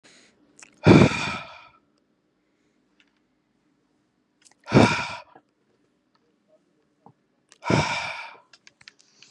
exhalation_length: 9.3 s
exhalation_amplitude: 31194
exhalation_signal_mean_std_ratio: 0.26
survey_phase: beta (2021-08-13 to 2022-03-07)
age: 18-44
gender: Male
wearing_mask: 'No'
symptom_none: true
smoker_status: Prefer not to say
respiratory_condition_asthma: false
respiratory_condition_other: false
recruitment_source: REACT
submission_delay: 0 days
covid_test_result: Negative
covid_test_method: RT-qPCR
influenza_a_test_result: Unknown/Void
influenza_b_test_result: Unknown/Void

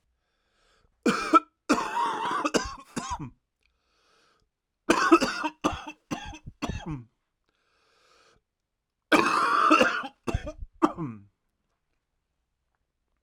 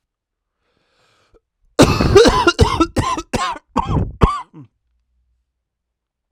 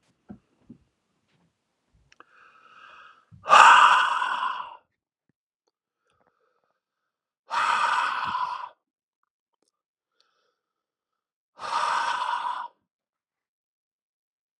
three_cough_length: 13.2 s
three_cough_amplitude: 19296
three_cough_signal_mean_std_ratio: 0.39
cough_length: 6.3 s
cough_amplitude: 32768
cough_signal_mean_std_ratio: 0.4
exhalation_length: 14.6 s
exhalation_amplitude: 32497
exhalation_signal_mean_std_ratio: 0.3
survey_phase: alpha (2021-03-01 to 2021-08-12)
age: 18-44
gender: Male
wearing_mask: 'No'
symptom_cough_any: true
symptom_fatigue: true
smoker_status: Never smoked
respiratory_condition_asthma: false
respiratory_condition_other: false
recruitment_source: Test and Trace
submission_delay: 2 days
covid_test_result: Positive
covid_test_method: RT-qPCR
covid_ct_value: 17.6
covid_ct_gene: ORF1ab gene
covid_ct_mean: 18.4
covid_viral_load: 930000 copies/ml
covid_viral_load_category: Low viral load (10K-1M copies/ml)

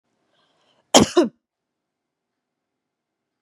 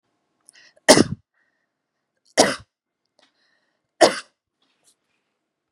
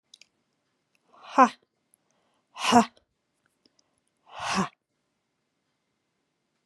cough_length: 3.4 s
cough_amplitude: 32768
cough_signal_mean_std_ratio: 0.2
three_cough_length: 5.7 s
three_cough_amplitude: 32768
three_cough_signal_mean_std_ratio: 0.2
exhalation_length: 6.7 s
exhalation_amplitude: 21989
exhalation_signal_mean_std_ratio: 0.2
survey_phase: beta (2021-08-13 to 2022-03-07)
age: 18-44
gender: Female
wearing_mask: 'No'
symptom_none: true
symptom_onset: 11 days
smoker_status: Never smoked
respiratory_condition_asthma: false
respiratory_condition_other: false
recruitment_source: REACT
submission_delay: 0 days
covid_test_result: Negative
covid_test_method: RT-qPCR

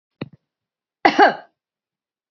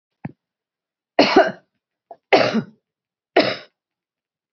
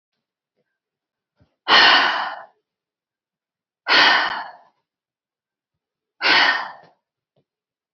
cough_length: 2.3 s
cough_amplitude: 27865
cough_signal_mean_std_ratio: 0.25
three_cough_length: 4.5 s
three_cough_amplitude: 30677
three_cough_signal_mean_std_ratio: 0.31
exhalation_length: 7.9 s
exhalation_amplitude: 28033
exhalation_signal_mean_std_ratio: 0.35
survey_phase: beta (2021-08-13 to 2022-03-07)
age: 65+
gender: Female
wearing_mask: 'No'
symptom_none: true
smoker_status: Never smoked
respiratory_condition_asthma: false
respiratory_condition_other: false
recruitment_source: Test and Trace
submission_delay: 2 days
covid_test_result: Positive
covid_test_method: RT-qPCR
covid_ct_value: 31.2
covid_ct_gene: ORF1ab gene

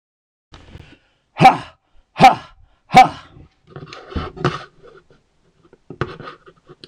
exhalation_length: 6.9 s
exhalation_amplitude: 26028
exhalation_signal_mean_std_ratio: 0.26
survey_phase: beta (2021-08-13 to 2022-03-07)
age: 45-64
gender: Male
wearing_mask: 'No'
symptom_cough_any: true
smoker_status: Ex-smoker
respiratory_condition_asthma: false
respiratory_condition_other: false
recruitment_source: REACT
submission_delay: 14 days
covid_test_result: Negative
covid_test_method: RT-qPCR
influenza_a_test_result: Unknown/Void
influenza_b_test_result: Unknown/Void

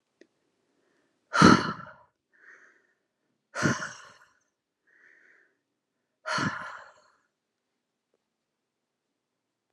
exhalation_length: 9.7 s
exhalation_amplitude: 20267
exhalation_signal_mean_std_ratio: 0.21
survey_phase: alpha (2021-03-01 to 2021-08-12)
age: 18-44
gender: Female
wearing_mask: 'No'
symptom_cough_any: true
symptom_fatigue: true
symptom_headache: true
smoker_status: Never smoked
respiratory_condition_asthma: false
respiratory_condition_other: false
recruitment_source: Test and Trace
submission_delay: 2 days
covid_test_result: Positive
covid_test_method: RT-qPCR
covid_ct_value: 18.4
covid_ct_gene: ORF1ab gene
covid_ct_mean: 18.9
covid_viral_load: 650000 copies/ml
covid_viral_load_category: Low viral load (10K-1M copies/ml)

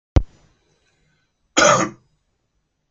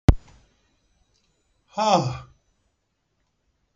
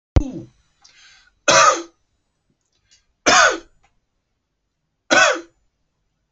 cough_length: 2.9 s
cough_amplitude: 31674
cough_signal_mean_std_ratio: 0.28
exhalation_length: 3.8 s
exhalation_amplitude: 26251
exhalation_signal_mean_std_ratio: 0.24
three_cough_length: 6.3 s
three_cough_amplitude: 31933
three_cough_signal_mean_std_ratio: 0.32
survey_phase: beta (2021-08-13 to 2022-03-07)
age: 45-64
gender: Male
wearing_mask: 'No'
symptom_none: true
smoker_status: Never smoked
respiratory_condition_asthma: false
respiratory_condition_other: false
recruitment_source: REACT
submission_delay: 1 day
covid_test_result: Negative
covid_test_method: RT-qPCR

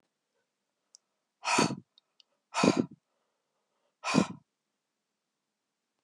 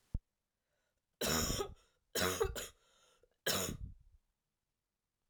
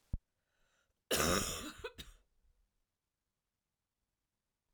exhalation_length: 6.0 s
exhalation_amplitude: 12917
exhalation_signal_mean_std_ratio: 0.26
three_cough_length: 5.3 s
three_cough_amplitude: 3061
three_cough_signal_mean_std_ratio: 0.41
cough_length: 4.7 s
cough_amplitude: 3981
cough_signal_mean_std_ratio: 0.29
survey_phase: alpha (2021-03-01 to 2021-08-12)
age: 45-64
gender: Female
wearing_mask: 'No'
symptom_cough_any: true
symptom_fatigue: true
symptom_fever_high_temperature: true
symptom_headache: true
symptom_change_to_sense_of_smell_or_taste: true
symptom_onset: 3 days
smoker_status: Never smoked
respiratory_condition_asthma: false
respiratory_condition_other: false
recruitment_source: Test and Trace
submission_delay: 2 days
covid_test_result: Positive
covid_test_method: RT-qPCR
covid_ct_value: 14.8
covid_ct_gene: ORF1ab gene
covid_ct_mean: 15.2
covid_viral_load: 11000000 copies/ml
covid_viral_load_category: High viral load (>1M copies/ml)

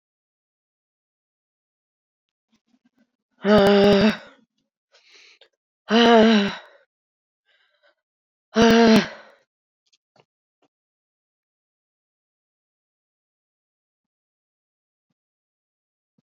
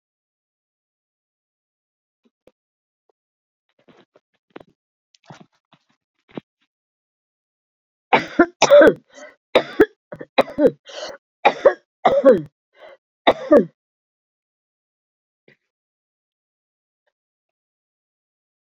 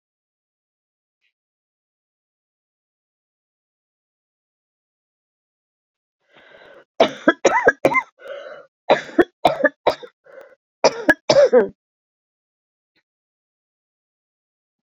exhalation_length: 16.4 s
exhalation_amplitude: 22446
exhalation_signal_mean_std_ratio: 0.27
three_cough_length: 18.8 s
three_cough_amplitude: 32767
three_cough_signal_mean_std_ratio: 0.22
cough_length: 14.9 s
cough_amplitude: 30677
cough_signal_mean_std_ratio: 0.24
survey_phase: beta (2021-08-13 to 2022-03-07)
age: 65+
gender: Female
wearing_mask: 'No'
symptom_cough_any: true
symptom_runny_or_blocked_nose: true
symptom_shortness_of_breath: true
symptom_fatigue: true
symptom_headache: true
symptom_loss_of_taste: true
symptom_onset: 3 days
smoker_status: Never smoked
respiratory_condition_asthma: false
respiratory_condition_other: false
recruitment_source: Test and Trace
submission_delay: 1 day
covid_test_result: Positive
covid_test_method: RT-qPCR
covid_ct_value: 22.5
covid_ct_gene: ORF1ab gene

